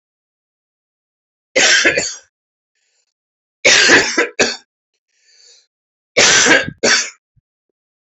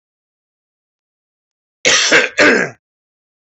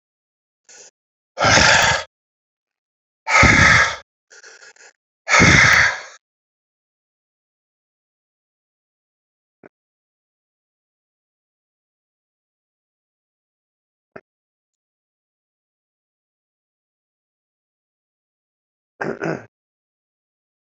{"three_cough_length": "8.0 s", "three_cough_amplitude": 32768, "three_cough_signal_mean_std_ratio": 0.41, "cough_length": "3.4 s", "cough_amplitude": 32451, "cough_signal_mean_std_ratio": 0.37, "exhalation_length": "20.7 s", "exhalation_amplitude": 31358, "exhalation_signal_mean_std_ratio": 0.25, "survey_phase": "alpha (2021-03-01 to 2021-08-12)", "age": "45-64", "gender": "Male", "wearing_mask": "No", "symptom_new_continuous_cough": true, "symptom_fever_high_temperature": true, "symptom_headache": true, "smoker_status": "Never smoked", "respiratory_condition_asthma": false, "respiratory_condition_other": false, "recruitment_source": "Test and Trace", "submission_delay": "2 days", "covid_test_result": "Positive", "covid_test_method": "RT-qPCR"}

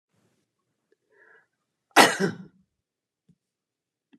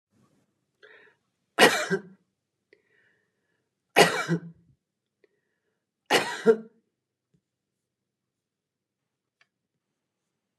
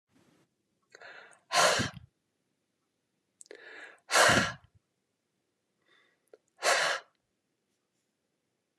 {"cough_length": "4.2 s", "cough_amplitude": 28992, "cough_signal_mean_std_ratio": 0.19, "three_cough_length": "10.6 s", "three_cough_amplitude": 22579, "three_cough_signal_mean_std_ratio": 0.22, "exhalation_length": "8.8 s", "exhalation_amplitude": 11165, "exhalation_signal_mean_std_ratio": 0.29, "survey_phase": "beta (2021-08-13 to 2022-03-07)", "age": "65+", "gender": "Female", "wearing_mask": "No", "symptom_none": true, "smoker_status": "Ex-smoker", "respiratory_condition_asthma": false, "respiratory_condition_other": false, "recruitment_source": "REACT", "submission_delay": "2 days", "covid_test_result": "Negative", "covid_test_method": "RT-qPCR", "influenza_a_test_result": "Negative", "influenza_b_test_result": "Negative"}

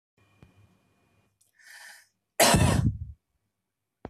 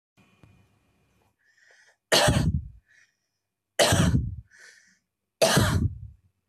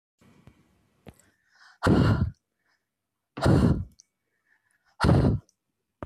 {"cough_length": "4.1 s", "cough_amplitude": 18897, "cough_signal_mean_std_ratio": 0.32, "three_cough_length": "6.5 s", "three_cough_amplitude": 16946, "three_cough_signal_mean_std_ratio": 0.41, "exhalation_length": "6.1 s", "exhalation_amplitude": 12804, "exhalation_signal_mean_std_ratio": 0.38, "survey_phase": "beta (2021-08-13 to 2022-03-07)", "age": "18-44", "gender": "Female", "wearing_mask": "No", "symptom_none": true, "smoker_status": "Ex-smoker", "respiratory_condition_asthma": false, "respiratory_condition_other": false, "recruitment_source": "Test and Trace", "submission_delay": "1 day", "covid_test_result": "Negative", "covid_test_method": "LFT"}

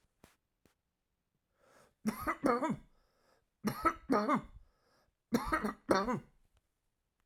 {"three_cough_length": "7.3 s", "three_cough_amplitude": 7545, "three_cough_signal_mean_std_ratio": 0.39, "survey_phase": "alpha (2021-03-01 to 2021-08-12)", "age": "45-64", "gender": "Male", "wearing_mask": "No", "symptom_none": true, "smoker_status": "Never smoked", "respiratory_condition_asthma": true, "respiratory_condition_other": false, "recruitment_source": "REACT", "submission_delay": "1 day", "covid_test_result": "Negative", "covid_test_method": "RT-qPCR"}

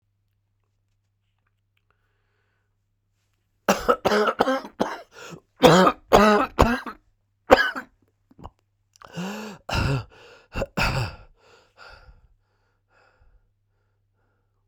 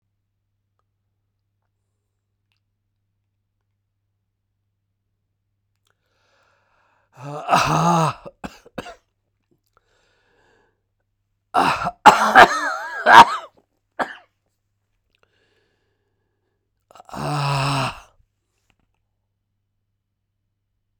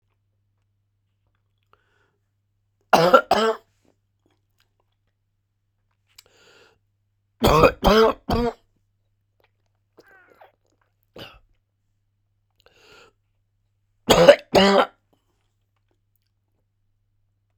{"cough_length": "14.7 s", "cough_amplitude": 32768, "cough_signal_mean_std_ratio": 0.32, "exhalation_length": "21.0 s", "exhalation_amplitude": 32768, "exhalation_signal_mean_std_ratio": 0.24, "three_cough_length": "17.6 s", "three_cough_amplitude": 32768, "three_cough_signal_mean_std_ratio": 0.25, "survey_phase": "beta (2021-08-13 to 2022-03-07)", "age": "65+", "gender": "Male", "wearing_mask": "No", "symptom_cough_any": true, "symptom_runny_or_blocked_nose": true, "symptom_shortness_of_breath": true, "symptom_sore_throat": true, "symptom_fatigue": true, "symptom_fever_high_temperature": true, "symptom_headache": true, "smoker_status": "Ex-smoker", "respiratory_condition_asthma": false, "respiratory_condition_other": false, "recruitment_source": "Test and Trace", "submission_delay": "2 days", "covid_test_result": "Positive", "covid_test_method": "LFT"}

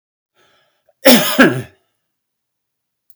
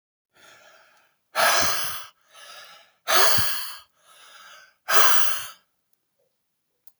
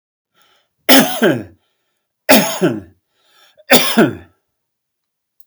{"cough_length": "3.2 s", "cough_amplitude": 32768, "cough_signal_mean_std_ratio": 0.3, "exhalation_length": "7.0 s", "exhalation_amplitude": 28879, "exhalation_signal_mean_std_ratio": 0.4, "three_cough_length": "5.5 s", "three_cough_amplitude": 32768, "three_cough_signal_mean_std_ratio": 0.37, "survey_phase": "beta (2021-08-13 to 2022-03-07)", "age": "45-64", "gender": "Male", "wearing_mask": "No", "symptom_none": true, "smoker_status": "Ex-smoker", "respiratory_condition_asthma": false, "respiratory_condition_other": false, "recruitment_source": "REACT", "submission_delay": "2 days", "covid_test_result": "Negative", "covid_test_method": "RT-qPCR", "influenza_a_test_result": "Negative", "influenza_b_test_result": "Negative"}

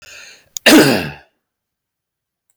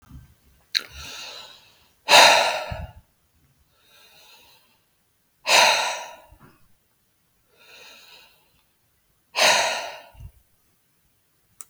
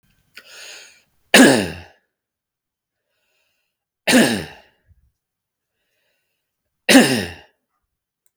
{"cough_length": "2.6 s", "cough_amplitude": 32768, "cough_signal_mean_std_ratio": 0.33, "exhalation_length": "11.7 s", "exhalation_amplitude": 32768, "exhalation_signal_mean_std_ratio": 0.3, "three_cough_length": "8.4 s", "three_cough_amplitude": 32768, "three_cough_signal_mean_std_ratio": 0.27, "survey_phase": "beta (2021-08-13 to 2022-03-07)", "age": "45-64", "gender": "Male", "wearing_mask": "No", "symptom_fatigue": true, "symptom_headache": true, "smoker_status": "Never smoked", "respiratory_condition_asthma": false, "respiratory_condition_other": false, "recruitment_source": "REACT", "submission_delay": "2 days", "covid_test_result": "Negative", "covid_test_method": "RT-qPCR", "influenza_a_test_result": "Negative", "influenza_b_test_result": "Negative"}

